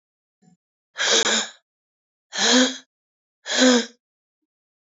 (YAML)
exhalation_length: 4.9 s
exhalation_amplitude: 27819
exhalation_signal_mean_std_ratio: 0.4
survey_phase: beta (2021-08-13 to 2022-03-07)
age: 18-44
gender: Female
wearing_mask: 'No'
symptom_cough_any: true
symptom_new_continuous_cough: true
symptom_runny_or_blocked_nose: true
symptom_sore_throat: true
symptom_abdominal_pain: true
symptom_fatigue: true
symptom_headache: true
symptom_change_to_sense_of_smell_or_taste: true
symptom_other: true
smoker_status: Current smoker (11 or more cigarettes per day)
respiratory_condition_asthma: false
respiratory_condition_other: false
recruitment_source: Test and Trace
submission_delay: 2 days
covid_test_result: Positive
covid_test_method: RT-qPCR
covid_ct_value: 18.9
covid_ct_gene: N gene
covid_ct_mean: 19.2
covid_viral_load: 510000 copies/ml
covid_viral_load_category: Low viral load (10K-1M copies/ml)